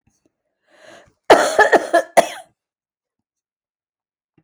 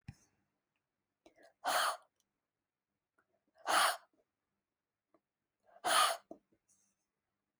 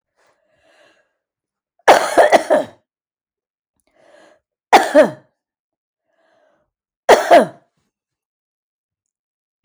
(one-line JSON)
{"cough_length": "4.4 s", "cough_amplitude": 31945, "cough_signal_mean_std_ratio": 0.29, "exhalation_length": "7.6 s", "exhalation_amplitude": 4946, "exhalation_signal_mean_std_ratio": 0.28, "three_cough_length": "9.6 s", "three_cough_amplitude": 32768, "three_cough_signal_mean_std_ratio": 0.28, "survey_phase": "alpha (2021-03-01 to 2021-08-12)", "age": "45-64", "gender": "Female", "wearing_mask": "No", "symptom_cough_any": true, "symptom_new_continuous_cough": true, "symptom_onset": "12 days", "smoker_status": "Never smoked", "respiratory_condition_asthma": false, "respiratory_condition_other": true, "recruitment_source": "REACT", "submission_delay": "3 days", "covid_test_result": "Negative", "covid_test_method": "RT-qPCR"}